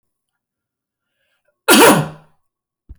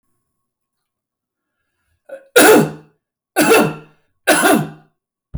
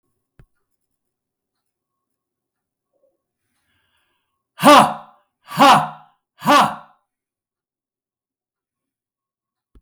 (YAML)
cough_length: 3.0 s
cough_amplitude: 32470
cough_signal_mean_std_ratio: 0.3
three_cough_length: 5.4 s
three_cough_amplitude: 32371
three_cough_signal_mean_std_ratio: 0.38
exhalation_length: 9.8 s
exhalation_amplitude: 32766
exhalation_signal_mean_std_ratio: 0.24
survey_phase: beta (2021-08-13 to 2022-03-07)
age: 45-64
gender: Male
wearing_mask: 'No'
symptom_cough_any: true
symptom_shortness_of_breath: true
smoker_status: Ex-smoker
respiratory_condition_asthma: false
respiratory_condition_other: false
recruitment_source: REACT
submission_delay: 1 day
covid_test_result: Negative
covid_test_method: RT-qPCR
influenza_a_test_result: Negative
influenza_b_test_result: Negative